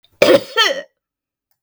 {"cough_length": "1.6 s", "cough_amplitude": 32768, "cough_signal_mean_std_ratio": 0.39, "survey_phase": "beta (2021-08-13 to 2022-03-07)", "age": "45-64", "gender": "Female", "wearing_mask": "No", "symptom_none": true, "smoker_status": "Never smoked", "respiratory_condition_asthma": true, "respiratory_condition_other": false, "recruitment_source": "REACT", "submission_delay": "1 day", "covid_test_result": "Negative", "covid_test_method": "RT-qPCR"}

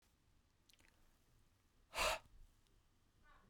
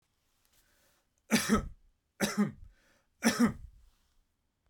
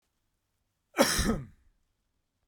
{"exhalation_length": "3.5 s", "exhalation_amplitude": 1497, "exhalation_signal_mean_std_ratio": 0.27, "three_cough_length": "4.7 s", "three_cough_amplitude": 8045, "three_cough_signal_mean_std_ratio": 0.35, "cough_length": "2.5 s", "cough_amplitude": 14280, "cough_signal_mean_std_ratio": 0.32, "survey_phase": "beta (2021-08-13 to 2022-03-07)", "age": "45-64", "gender": "Male", "wearing_mask": "No", "symptom_none": true, "smoker_status": "Ex-smoker", "respiratory_condition_asthma": false, "respiratory_condition_other": false, "recruitment_source": "REACT", "submission_delay": "2 days", "covid_test_result": "Negative", "covid_test_method": "RT-qPCR"}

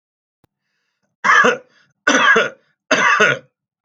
{"three_cough_length": "3.8 s", "three_cough_amplitude": 32201, "three_cough_signal_mean_std_ratio": 0.47, "survey_phase": "alpha (2021-03-01 to 2021-08-12)", "age": "45-64", "gender": "Male", "wearing_mask": "No", "symptom_none": true, "symptom_onset": "6 days", "smoker_status": "Ex-smoker", "respiratory_condition_asthma": false, "respiratory_condition_other": false, "recruitment_source": "REACT", "submission_delay": "1 day", "covid_test_result": "Negative", "covid_test_method": "RT-qPCR"}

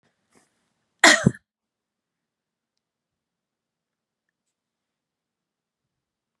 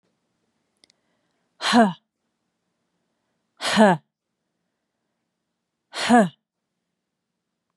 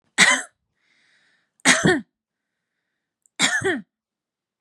{"cough_length": "6.4 s", "cough_amplitude": 29933, "cough_signal_mean_std_ratio": 0.13, "exhalation_length": "7.8 s", "exhalation_amplitude": 25604, "exhalation_signal_mean_std_ratio": 0.25, "three_cough_length": "4.6 s", "three_cough_amplitude": 31400, "three_cough_signal_mean_std_ratio": 0.34, "survey_phase": "beta (2021-08-13 to 2022-03-07)", "age": "45-64", "gender": "Female", "wearing_mask": "No", "symptom_none": true, "smoker_status": "Never smoked", "respiratory_condition_asthma": false, "respiratory_condition_other": false, "recruitment_source": "REACT", "submission_delay": "7 days", "covid_test_result": "Negative", "covid_test_method": "RT-qPCR", "influenza_a_test_result": "Negative", "influenza_b_test_result": "Negative"}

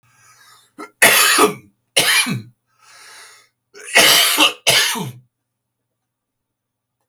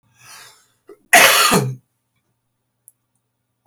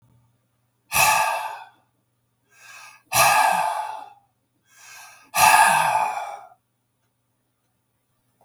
{"three_cough_length": "7.1 s", "three_cough_amplitude": 32768, "three_cough_signal_mean_std_ratio": 0.43, "cough_length": "3.7 s", "cough_amplitude": 32768, "cough_signal_mean_std_ratio": 0.32, "exhalation_length": "8.4 s", "exhalation_amplitude": 26929, "exhalation_signal_mean_std_ratio": 0.42, "survey_phase": "beta (2021-08-13 to 2022-03-07)", "age": "65+", "gender": "Male", "wearing_mask": "No", "symptom_change_to_sense_of_smell_or_taste": true, "smoker_status": "Ex-smoker", "respiratory_condition_asthma": false, "respiratory_condition_other": false, "recruitment_source": "REACT", "submission_delay": "1 day", "covid_test_result": "Negative", "covid_test_method": "RT-qPCR", "influenza_a_test_result": "Negative", "influenza_b_test_result": "Negative"}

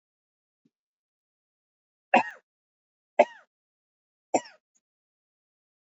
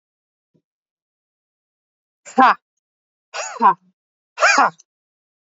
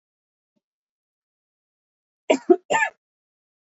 {"three_cough_length": "5.9 s", "three_cough_amplitude": 17769, "three_cough_signal_mean_std_ratio": 0.14, "exhalation_length": "5.5 s", "exhalation_amplitude": 27617, "exhalation_signal_mean_std_ratio": 0.26, "cough_length": "3.8 s", "cough_amplitude": 24467, "cough_signal_mean_std_ratio": 0.21, "survey_phase": "beta (2021-08-13 to 2022-03-07)", "age": "18-44", "gender": "Female", "wearing_mask": "Yes", "symptom_none": true, "symptom_onset": "5 days", "smoker_status": "Ex-smoker", "respiratory_condition_asthma": false, "respiratory_condition_other": false, "recruitment_source": "REACT", "submission_delay": "3 days", "covid_test_result": "Negative", "covid_test_method": "RT-qPCR", "influenza_a_test_result": "Unknown/Void", "influenza_b_test_result": "Unknown/Void"}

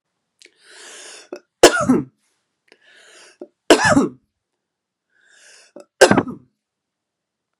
{"three_cough_length": "7.6 s", "three_cough_amplitude": 32768, "three_cough_signal_mean_std_ratio": 0.27, "survey_phase": "beta (2021-08-13 to 2022-03-07)", "age": "45-64", "gender": "Female", "wearing_mask": "No", "symptom_runny_or_blocked_nose": true, "symptom_onset": "5 days", "smoker_status": "Never smoked", "respiratory_condition_asthma": true, "respiratory_condition_other": false, "recruitment_source": "REACT", "submission_delay": "2 days", "covid_test_result": "Negative", "covid_test_method": "RT-qPCR", "influenza_a_test_result": "Negative", "influenza_b_test_result": "Negative"}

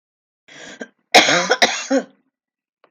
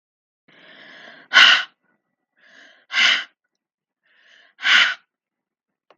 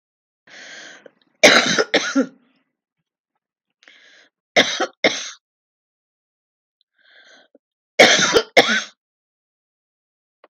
{"cough_length": "2.9 s", "cough_amplitude": 32766, "cough_signal_mean_std_ratio": 0.37, "exhalation_length": "6.0 s", "exhalation_amplitude": 32768, "exhalation_signal_mean_std_ratio": 0.3, "three_cough_length": "10.5 s", "three_cough_amplitude": 32768, "three_cough_signal_mean_std_ratio": 0.3, "survey_phase": "beta (2021-08-13 to 2022-03-07)", "age": "45-64", "gender": "Female", "wearing_mask": "No", "symptom_none": true, "smoker_status": "Never smoked", "respiratory_condition_asthma": false, "respiratory_condition_other": false, "recruitment_source": "REACT", "submission_delay": "3 days", "covid_test_result": "Negative", "covid_test_method": "RT-qPCR", "influenza_a_test_result": "Unknown/Void", "influenza_b_test_result": "Unknown/Void"}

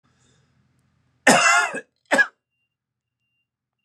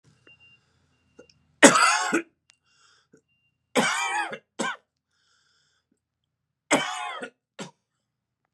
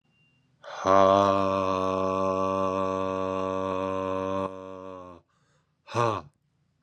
{"cough_length": "3.8 s", "cough_amplitude": 30913, "cough_signal_mean_std_ratio": 0.31, "three_cough_length": "8.5 s", "three_cough_amplitude": 32764, "three_cough_signal_mean_std_ratio": 0.29, "exhalation_length": "6.8 s", "exhalation_amplitude": 13694, "exhalation_signal_mean_std_ratio": 0.58, "survey_phase": "beta (2021-08-13 to 2022-03-07)", "age": "45-64", "gender": "Male", "wearing_mask": "No", "symptom_cough_any": true, "symptom_runny_or_blocked_nose": true, "symptom_fatigue": true, "smoker_status": "Never smoked", "respiratory_condition_asthma": false, "respiratory_condition_other": false, "recruitment_source": "Test and Trace", "submission_delay": "2 days", "covid_test_result": "Positive", "covid_test_method": "RT-qPCR", "covid_ct_value": 31.6, "covid_ct_gene": "ORF1ab gene"}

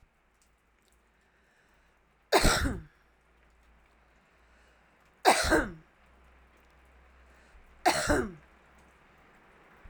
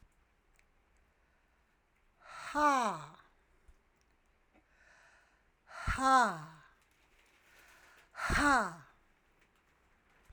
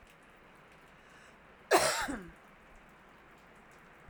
{"three_cough_length": "9.9 s", "three_cough_amplitude": 16716, "three_cough_signal_mean_std_ratio": 0.29, "exhalation_length": "10.3 s", "exhalation_amplitude": 5490, "exhalation_signal_mean_std_ratio": 0.32, "cough_length": "4.1 s", "cough_amplitude": 10389, "cough_signal_mean_std_ratio": 0.32, "survey_phase": "alpha (2021-03-01 to 2021-08-12)", "age": "65+", "gender": "Female", "wearing_mask": "No", "symptom_none": true, "smoker_status": "Ex-smoker", "respiratory_condition_asthma": false, "respiratory_condition_other": false, "recruitment_source": "REACT", "submission_delay": "1 day", "covid_test_result": "Negative", "covid_test_method": "RT-qPCR"}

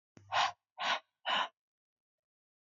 {"exhalation_length": "2.7 s", "exhalation_amplitude": 3917, "exhalation_signal_mean_std_ratio": 0.38, "survey_phase": "alpha (2021-03-01 to 2021-08-12)", "age": "18-44", "gender": "Female", "wearing_mask": "No", "symptom_cough_any": true, "symptom_shortness_of_breath": true, "symptom_fatigue": true, "symptom_headache": true, "symptom_onset": "9 days", "smoker_status": "Never smoked", "respiratory_condition_asthma": false, "respiratory_condition_other": false, "recruitment_source": "Test and Trace", "submission_delay": "2 days", "covid_test_result": "Positive", "covid_test_method": "RT-qPCR", "covid_ct_value": 19.8, "covid_ct_gene": "ORF1ab gene", "covid_ct_mean": 20.6, "covid_viral_load": "180000 copies/ml", "covid_viral_load_category": "Low viral load (10K-1M copies/ml)"}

